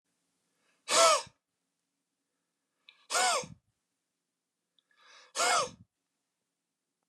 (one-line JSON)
{"exhalation_length": "7.1 s", "exhalation_amplitude": 11060, "exhalation_signal_mean_std_ratio": 0.29, "survey_phase": "beta (2021-08-13 to 2022-03-07)", "age": "45-64", "gender": "Male", "wearing_mask": "No", "symptom_none": true, "smoker_status": "Never smoked", "respiratory_condition_asthma": false, "respiratory_condition_other": false, "recruitment_source": "REACT", "submission_delay": "3 days", "covid_test_result": "Negative", "covid_test_method": "RT-qPCR"}